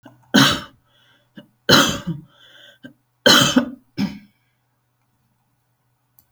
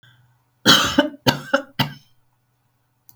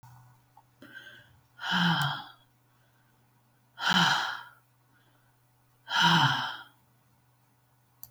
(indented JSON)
{
  "three_cough_length": "6.3 s",
  "three_cough_amplitude": 32768,
  "three_cough_signal_mean_std_ratio": 0.33,
  "cough_length": "3.2 s",
  "cough_amplitude": 32768,
  "cough_signal_mean_std_ratio": 0.34,
  "exhalation_length": "8.1 s",
  "exhalation_amplitude": 10012,
  "exhalation_signal_mean_std_ratio": 0.39,
  "survey_phase": "beta (2021-08-13 to 2022-03-07)",
  "age": "65+",
  "gender": "Female",
  "wearing_mask": "No",
  "symptom_none": true,
  "smoker_status": "Never smoked",
  "respiratory_condition_asthma": false,
  "respiratory_condition_other": false,
  "recruitment_source": "REACT",
  "submission_delay": "23 days",
  "covid_test_result": "Negative",
  "covid_test_method": "RT-qPCR",
  "influenza_a_test_result": "Negative",
  "influenza_b_test_result": "Negative"
}